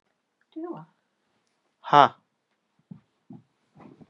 {
  "exhalation_length": "4.1 s",
  "exhalation_amplitude": 29055,
  "exhalation_signal_mean_std_ratio": 0.16,
  "survey_phase": "beta (2021-08-13 to 2022-03-07)",
  "age": "45-64",
  "gender": "Male",
  "wearing_mask": "No",
  "symptom_cough_any": true,
  "symptom_runny_or_blocked_nose": true,
  "symptom_sore_throat": true,
  "symptom_fatigue": true,
  "symptom_onset": "5 days",
  "smoker_status": "Never smoked",
  "respiratory_condition_asthma": false,
  "respiratory_condition_other": false,
  "recruitment_source": "REACT",
  "submission_delay": "1 day",
  "covid_test_result": "Negative",
  "covid_test_method": "RT-qPCR",
  "influenza_a_test_result": "Negative",
  "influenza_b_test_result": "Negative"
}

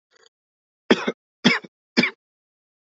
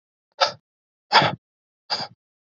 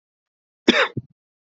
{
  "three_cough_length": "2.9 s",
  "three_cough_amplitude": 27143,
  "three_cough_signal_mean_std_ratio": 0.27,
  "exhalation_length": "2.6 s",
  "exhalation_amplitude": 30828,
  "exhalation_signal_mean_std_ratio": 0.29,
  "cough_length": "1.5 s",
  "cough_amplitude": 30168,
  "cough_signal_mean_std_ratio": 0.27,
  "survey_phase": "beta (2021-08-13 to 2022-03-07)",
  "age": "18-44",
  "gender": "Male",
  "wearing_mask": "No",
  "symptom_cough_any": true,
  "symptom_runny_or_blocked_nose": true,
  "symptom_sore_throat": true,
  "symptom_fatigue": true,
  "symptom_headache": true,
  "symptom_loss_of_taste": true,
  "smoker_status": "Never smoked",
  "respiratory_condition_asthma": false,
  "respiratory_condition_other": false,
  "recruitment_source": "Test and Trace",
  "submission_delay": "1 day",
  "covid_test_result": "Positive",
  "covid_test_method": "RT-qPCR",
  "covid_ct_value": 17.1,
  "covid_ct_gene": "ORF1ab gene",
  "covid_ct_mean": 17.3,
  "covid_viral_load": "2100000 copies/ml",
  "covid_viral_load_category": "High viral load (>1M copies/ml)"
}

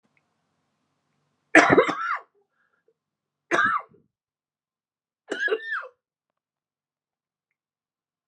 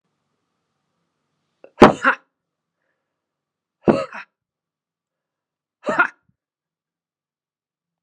{
  "three_cough_length": "8.3 s",
  "three_cough_amplitude": 31457,
  "three_cough_signal_mean_std_ratio": 0.26,
  "exhalation_length": "8.0 s",
  "exhalation_amplitude": 32768,
  "exhalation_signal_mean_std_ratio": 0.18,
  "survey_phase": "alpha (2021-03-01 to 2021-08-12)",
  "age": "45-64",
  "gender": "Female",
  "wearing_mask": "No",
  "symptom_cough_any": true,
  "symptom_shortness_of_breath": true,
  "symptom_fatigue": true,
  "symptom_onset": "12 days",
  "smoker_status": "Never smoked",
  "respiratory_condition_asthma": true,
  "respiratory_condition_other": false,
  "recruitment_source": "REACT",
  "submission_delay": "1 day",
  "covid_test_result": "Negative",
  "covid_test_method": "RT-qPCR"
}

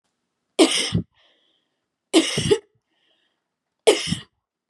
{
  "three_cough_length": "4.7 s",
  "three_cough_amplitude": 29858,
  "three_cough_signal_mean_std_ratio": 0.34,
  "survey_phase": "beta (2021-08-13 to 2022-03-07)",
  "age": "18-44",
  "gender": "Female",
  "wearing_mask": "No",
  "symptom_cough_any": true,
  "symptom_runny_or_blocked_nose": true,
  "symptom_onset": "12 days",
  "smoker_status": "Never smoked",
  "respiratory_condition_asthma": false,
  "respiratory_condition_other": false,
  "recruitment_source": "REACT",
  "submission_delay": "1 day",
  "covid_test_result": "Negative",
  "covid_test_method": "RT-qPCR",
  "influenza_a_test_result": "Negative",
  "influenza_b_test_result": "Negative"
}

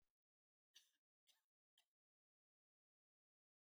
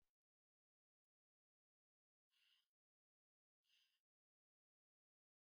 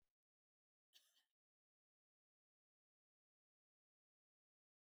{
  "three_cough_length": "3.7 s",
  "three_cough_amplitude": 71,
  "three_cough_signal_mean_std_ratio": 0.19,
  "exhalation_length": "5.5 s",
  "exhalation_amplitude": 16,
  "exhalation_signal_mean_std_ratio": 0.26,
  "cough_length": "4.9 s",
  "cough_amplitude": 62,
  "cough_signal_mean_std_ratio": 0.16,
  "survey_phase": "beta (2021-08-13 to 2022-03-07)",
  "age": "45-64",
  "gender": "Female",
  "wearing_mask": "No",
  "symptom_none": true,
  "smoker_status": "Never smoked",
  "respiratory_condition_asthma": false,
  "respiratory_condition_other": false,
  "recruitment_source": "REACT",
  "submission_delay": "3 days",
  "covid_test_result": "Negative",
  "covid_test_method": "RT-qPCR",
  "influenza_a_test_result": "Negative",
  "influenza_b_test_result": "Negative"
}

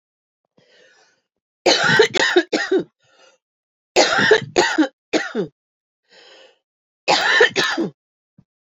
{
  "three_cough_length": "8.6 s",
  "three_cough_amplitude": 28437,
  "three_cough_signal_mean_std_ratio": 0.45,
  "survey_phase": "beta (2021-08-13 to 2022-03-07)",
  "age": "45-64",
  "gender": "Female",
  "wearing_mask": "No",
  "symptom_cough_any": true,
  "symptom_runny_or_blocked_nose": true,
  "symptom_sore_throat": true,
  "symptom_diarrhoea": true,
  "symptom_headache": true,
  "symptom_change_to_sense_of_smell_or_taste": true,
  "smoker_status": "Never smoked",
  "respiratory_condition_asthma": false,
  "respiratory_condition_other": false,
  "recruitment_source": "Test and Trace",
  "submission_delay": "1 day",
  "covid_test_result": "Positive",
  "covid_test_method": "ePCR"
}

